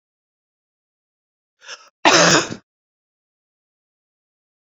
{
  "cough_length": "4.8 s",
  "cough_amplitude": 31707,
  "cough_signal_mean_std_ratio": 0.24,
  "survey_phase": "beta (2021-08-13 to 2022-03-07)",
  "age": "45-64",
  "gender": "Female",
  "wearing_mask": "No",
  "symptom_cough_any": true,
  "symptom_runny_or_blocked_nose": true,
  "symptom_sore_throat": true,
  "symptom_headache": true,
  "symptom_change_to_sense_of_smell_or_taste": true,
  "symptom_onset": "5 days",
  "smoker_status": "Never smoked",
  "respiratory_condition_asthma": false,
  "respiratory_condition_other": false,
  "recruitment_source": "Test and Trace",
  "submission_delay": "2 days",
  "covid_test_result": "Positive",
  "covid_test_method": "RT-qPCR",
  "covid_ct_value": 15.8,
  "covid_ct_gene": "ORF1ab gene",
  "covid_ct_mean": 16.4,
  "covid_viral_load": "4200000 copies/ml",
  "covid_viral_load_category": "High viral load (>1M copies/ml)"
}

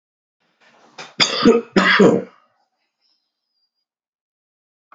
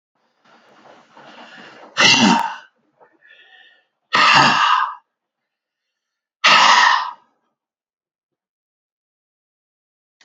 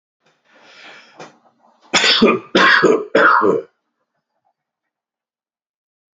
{
  "cough_length": "4.9 s",
  "cough_amplitude": 32632,
  "cough_signal_mean_std_ratio": 0.32,
  "exhalation_length": "10.2 s",
  "exhalation_amplitude": 32767,
  "exhalation_signal_mean_std_ratio": 0.36,
  "three_cough_length": "6.1 s",
  "three_cough_amplitude": 30301,
  "three_cough_signal_mean_std_ratio": 0.4,
  "survey_phase": "alpha (2021-03-01 to 2021-08-12)",
  "age": "45-64",
  "gender": "Male",
  "wearing_mask": "No",
  "symptom_cough_any": true,
  "smoker_status": "Ex-smoker",
  "respiratory_condition_asthma": false,
  "respiratory_condition_other": false,
  "recruitment_source": "REACT",
  "submission_delay": "1 day",
  "covid_test_result": "Negative",
  "covid_test_method": "RT-qPCR"
}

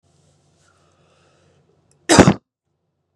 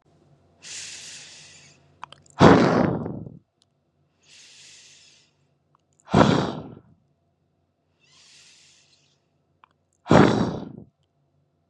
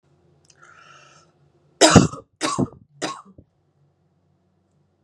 {
  "cough_length": "3.2 s",
  "cough_amplitude": 32768,
  "cough_signal_mean_std_ratio": 0.2,
  "exhalation_length": "11.7 s",
  "exhalation_amplitude": 31569,
  "exhalation_signal_mean_std_ratio": 0.28,
  "three_cough_length": "5.0 s",
  "three_cough_amplitude": 32768,
  "three_cough_signal_mean_std_ratio": 0.23,
  "survey_phase": "beta (2021-08-13 to 2022-03-07)",
  "age": "18-44",
  "gender": "Female",
  "wearing_mask": "No",
  "symptom_none": true,
  "smoker_status": "Never smoked",
  "respiratory_condition_asthma": false,
  "respiratory_condition_other": false,
  "recruitment_source": "REACT",
  "submission_delay": "1 day",
  "covid_test_result": "Negative",
  "covid_test_method": "RT-qPCR",
  "influenza_a_test_result": "Negative",
  "influenza_b_test_result": "Negative"
}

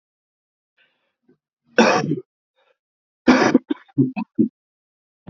{
  "three_cough_length": "5.3 s",
  "three_cough_amplitude": 30177,
  "three_cough_signal_mean_std_ratio": 0.32,
  "survey_phase": "beta (2021-08-13 to 2022-03-07)",
  "age": "65+",
  "gender": "Male",
  "wearing_mask": "No",
  "symptom_cough_any": true,
  "symptom_fatigue": true,
  "symptom_fever_high_temperature": true,
  "symptom_headache": true,
  "symptom_other": true,
  "smoker_status": "Ex-smoker",
  "respiratory_condition_asthma": false,
  "respiratory_condition_other": false,
  "recruitment_source": "Test and Trace",
  "submission_delay": "2 days",
  "covid_test_result": "Positive",
  "covid_test_method": "RT-qPCR",
  "covid_ct_value": 22.8,
  "covid_ct_gene": "ORF1ab gene",
  "covid_ct_mean": 23.6,
  "covid_viral_load": "18000 copies/ml",
  "covid_viral_load_category": "Low viral load (10K-1M copies/ml)"
}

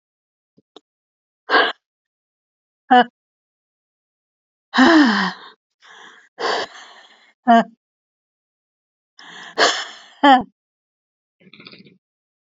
{
  "exhalation_length": "12.5 s",
  "exhalation_amplitude": 28912,
  "exhalation_signal_mean_std_ratio": 0.29,
  "survey_phase": "beta (2021-08-13 to 2022-03-07)",
  "age": "45-64",
  "gender": "Female",
  "wearing_mask": "No",
  "symptom_none": true,
  "symptom_onset": "13 days",
  "smoker_status": "Ex-smoker",
  "respiratory_condition_asthma": false,
  "respiratory_condition_other": true,
  "recruitment_source": "REACT",
  "submission_delay": "15 days",
  "covid_test_result": "Negative",
  "covid_test_method": "RT-qPCR",
  "influenza_a_test_result": "Negative",
  "influenza_b_test_result": "Negative"
}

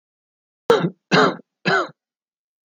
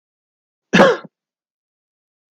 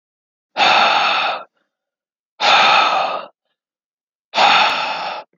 {
  "three_cough_length": "2.6 s",
  "three_cough_amplitude": 27291,
  "three_cough_signal_mean_std_ratio": 0.38,
  "cough_length": "2.3 s",
  "cough_amplitude": 29123,
  "cough_signal_mean_std_ratio": 0.25,
  "exhalation_length": "5.4 s",
  "exhalation_amplitude": 30517,
  "exhalation_signal_mean_std_ratio": 0.57,
  "survey_phase": "alpha (2021-03-01 to 2021-08-12)",
  "age": "18-44",
  "gender": "Male",
  "wearing_mask": "No",
  "symptom_none": true,
  "smoker_status": "Never smoked",
  "respiratory_condition_asthma": false,
  "respiratory_condition_other": false,
  "recruitment_source": "REACT",
  "submission_delay": "1 day",
  "covid_test_result": "Negative",
  "covid_test_method": "RT-qPCR"
}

